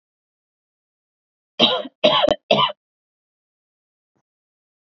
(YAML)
three_cough_length: 4.9 s
three_cough_amplitude: 28625
three_cough_signal_mean_std_ratio: 0.29
survey_phase: beta (2021-08-13 to 2022-03-07)
age: 18-44
gender: Female
wearing_mask: 'No'
symptom_none: true
symptom_onset: 11 days
smoker_status: Never smoked
respiratory_condition_asthma: false
respiratory_condition_other: false
recruitment_source: REACT
submission_delay: 2 days
covid_test_result: Negative
covid_test_method: RT-qPCR
influenza_a_test_result: Negative
influenza_b_test_result: Negative